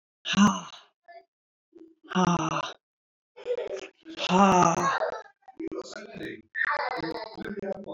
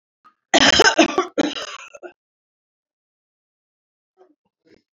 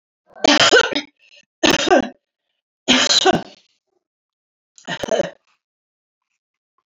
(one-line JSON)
{"exhalation_length": "7.9 s", "exhalation_amplitude": 17038, "exhalation_signal_mean_std_ratio": 0.49, "cough_length": "4.9 s", "cough_amplitude": 32016, "cough_signal_mean_std_ratio": 0.3, "three_cough_length": "7.0 s", "three_cough_amplitude": 32767, "three_cough_signal_mean_std_ratio": 0.37, "survey_phase": "beta (2021-08-13 to 2022-03-07)", "age": "65+", "gender": "Female", "wearing_mask": "No", "symptom_none": true, "smoker_status": "Never smoked", "respiratory_condition_asthma": false, "respiratory_condition_other": false, "recruitment_source": "REACT", "submission_delay": "4 days", "covid_test_result": "Negative", "covid_test_method": "RT-qPCR", "influenza_a_test_result": "Negative", "influenza_b_test_result": "Negative"}